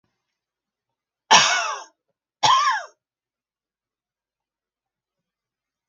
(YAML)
cough_length: 5.9 s
cough_amplitude: 30450
cough_signal_mean_std_ratio: 0.28
survey_phase: beta (2021-08-13 to 2022-03-07)
age: 65+
gender: Female
wearing_mask: 'No'
symptom_none: true
smoker_status: Never smoked
respiratory_condition_asthma: false
respiratory_condition_other: false
recruitment_source: REACT
submission_delay: 1 day
covid_test_result: Negative
covid_test_method: RT-qPCR